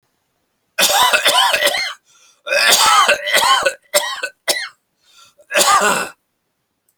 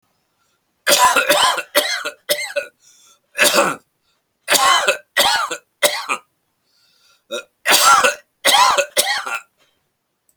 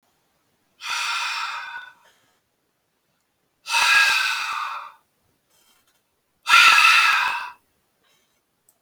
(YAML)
cough_length: 7.0 s
cough_amplitude: 32768
cough_signal_mean_std_ratio: 0.59
three_cough_length: 10.4 s
three_cough_amplitude: 32768
three_cough_signal_mean_std_ratio: 0.51
exhalation_length: 8.8 s
exhalation_amplitude: 28038
exhalation_signal_mean_std_ratio: 0.42
survey_phase: alpha (2021-03-01 to 2021-08-12)
age: 65+
gender: Male
wearing_mask: 'No'
symptom_cough_any: true
smoker_status: Never smoked
respiratory_condition_asthma: false
respiratory_condition_other: false
recruitment_source: REACT
submission_delay: 6 days
covid_test_result: Negative
covid_test_method: RT-qPCR